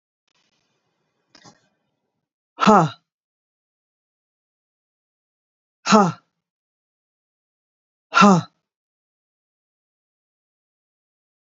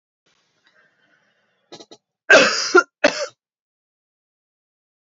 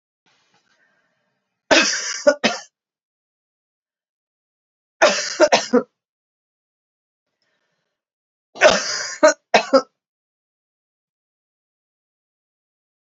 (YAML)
exhalation_length: 11.5 s
exhalation_amplitude: 29566
exhalation_signal_mean_std_ratio: 0.2
cough_length: 5.1 s
cough_amplitude: 28623
cough_signal_mean_std_ratio: 0.25
three_cough_length: 13.1 s
three_cough_amplitude: 29809
three_cough_signal_mean_std_ratio: 0.27
survey_phase: beta (2021-08-13 to 2022-03-07)
age: 45-64
gender: Female
wearing_mask: 'No'
symptom_cough_any: true
symptom_runny_or_blocked_nose: true
symptom_fatigue: true
symptom_headache: true
smoker_status: Never smoked
respiratory_condition_asthma: false
respiratory_condition_other: false
recruitment_source: Test and Trace
submission_delay: 2 days
covid_test_result: Positive
covid_test_method: RT-qPCR
covid_ct_value: 14.1
covid_ct_gene: N gene
covid_ct_mean: 14.5
covid_viral_load: 18000000 copies/ml
covid_viral_load_category: High viral load (>1M copies/ml)